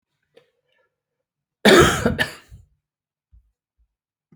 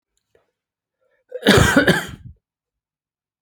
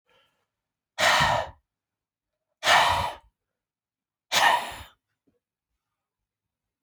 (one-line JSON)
{"cough_length": "4.4 s", "cough_amplitude": 30112, "cough_signal_mean_std_ratio": 0.26, "three_cough_length": "3.4 s", "three_cough_amplitude": 32767, "three_cough_signal_mean_std_ratio": 0.33, "exhalation_length": "6.8 s", "exhalation_amplitude": 15455, "exhalation_signal_mean_std_ratio": 0.35, "survey_phase": "beta (2021-08-13 to 2022-03-07)", "age": "45-64", "gender": "Male", "wearing_mask": "No", "symptom_cough_any": true, "smoker_status": "Ex-smoker", "respiratory_condition_asthma": false, "respiratory_condition_other": false, "recruitment_source": "REACT", "submission_delay": "4 days", "covid_test_result": "Negative", "covid_test_method": "RT-qPCR"}